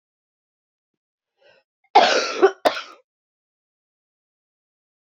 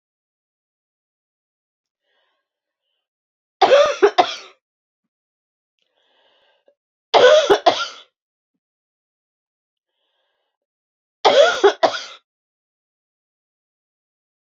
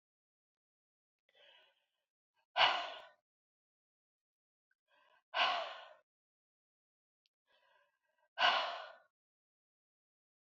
{"cough_length": "5.0 s", "cough_amplitude": 27747, "cough_signal_mean_std_ratio": 0.25, "three_cough_length": "14.4 s", "three_cough_amplitude": 32767, "three_cough_signal_mean_std_ratio": 0.26, "exhalation_length": "10.5 s", "exhalation_amplitude": 6545, "exhalation_signal_mean_std_ratio": 0.24, "survey_phase": "beta (2021-08-13 to 2022-03-07)", "age": "45-64", "gender": "Female", "wearing_mask": "No", "symptom_cough_any": true, "symptom_runny_or_blocked_nose": true, "symptom_fatigue": true, "symptom_headache": true, "smoker_status": "Never smoked", "respiratory_condition_asthma": false, "respiratory_condition_other": false, "recruitment_source": "Test and Trace", "submission_delay": "2 days", "covid_test_result": "Positive", "covid_test_method": "ePCR"}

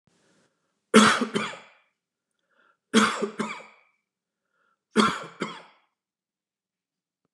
{"three_cough_length": "7.3 s", "three_cough_amplitude": 24855, "three_cough_signal_mean_std_ratio": 0.29, "survey_phase": "beta (2021-08-13 to 2022-03-07)", "age": "65+", "gender": "Male", "wearing_mask": "No", "symptom_none": true, "smoker_status": "Ex-smoker", "respiratory_condition_asthma": false, "respiratory_condition_other": false, "recruitment_source": "REACT", "submission_delay": "0 days", "covid_test_result": "Negative", "covid_test_method": "RT-qPCR", "influenza_a_test_result": "Negative", "influenza_b_test_result": "Negative"}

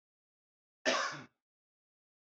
{"cough_length": "2.3 s", "cough_amplitude": 4449, "cough_signal_mean_std_ratio": 0.28, "survey_phase": "alpha (2021-03-01 to 2021-08-12)", "age": "18-44", "gender": "Male", "wearing_mask": "No", "symptom_none": true, "smoker_status": "Never smoked", "respiratory_condition_asthma": false, "respiratory_condition_other": false, "recruitment_source": "REACT", "submission_delay": "1 day", "covid_test_result": "Negative", "covid_test_method": "RT-qPCR"}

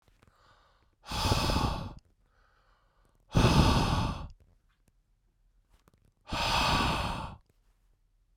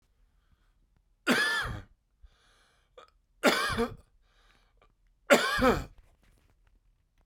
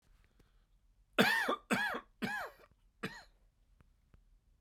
{"exhalation_length": "8.4 s", "exhalation_amplitude": 11243, "exhalation_signal_mean_std_ratio": 0.45, "three_cough_length": "7.3 s", "three_cough_amplitude": 16606, "three_cough_signal_mean_std_ratio": 0.34, "cough_length": "4.6 s", "cough_amplitude": 6990, "cough_signal_mean_std_ratio": 0.37, "survey_phase": "beta (2021-08-13 to 2022-03-07)", "age": "45-64", "gender": "Male", "wearing_mask": "No", "symptom_cough_any": true, "symptom_runny_or_blocked_nose": true, "symptom_abdominal_pain": true, "symptom_diarrhoea": true, "symptom_fatigue": true, "symptom_headache": true, "smoker_status": "Never smoked", "respiratory_condition_asthma": false, "respiratory_condition_other": false, "recruitment_source": "Test and Trace", "submission_delay": "1 day", "covid_test_result": "Positive", "covid_test_method": "RT-qPCR", "covid_ct_value": 20.8, "covid_ct_gene": "ORF1ab gene", "covid_ct_mean": 21.2, "covid_viral_load": "110000 copies/ml", "covid_viral_load_category": "Low viral load (10K-1M copies/ml)"}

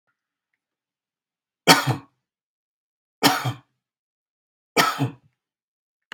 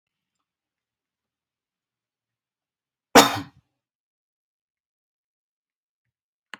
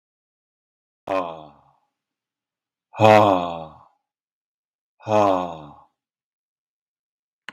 {"three_cough_length": "6.1 s", "three_cough_amplitude": 32768, "three_cough_signal_mean_std_ratio": 0.26, "cough_length": "6.6 s", "cough_amplitude": 32767, "cough_signal_mean_std_ratio": 0.12, "exhalation_length": "7.5 s", "exhalation_amplitude": 32767, "exhalation_signal_mean_std_ratio": 0.28, "survey_phase": "beta (2021-08-13 to 2022-03-07)", "age": "45-64", "gender": "Male", "wearing_mask": "No", "symptom_none": true, "smoker_status": "Ex-smoker", "respiratory_condition_asthma": false, "respiratory_condition_other": false, "recruitment_source": "REACT", "submission_delay": "1 day", "covid_test_result": "Negative", "covid_test_method": "RT-qPCR"}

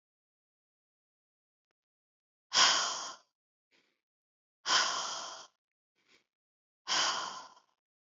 {"exhalation_length": "8.1 s", "exhalation_amplitude": 8325, "exhalation_signal_mean_std_ratio": 0.32, "survey_phase": "beta (2021-08-13 to 2022-03-07)", "age": "65+", "gender": "Female", "wearing_mask": "No", "symptom_none": true, "smoker_status": "Never smoked", "respiratory_condition_asthma": false, "respiratory_condition_other": false, "recruitment_source": "REACT", "submission_delay": "2 days", "covid_test_result": "Negative", "covid_test_method": "RT-qPCR", "influenza_a_test_result": "Negative", "influenza_b_test_result": "Negative"}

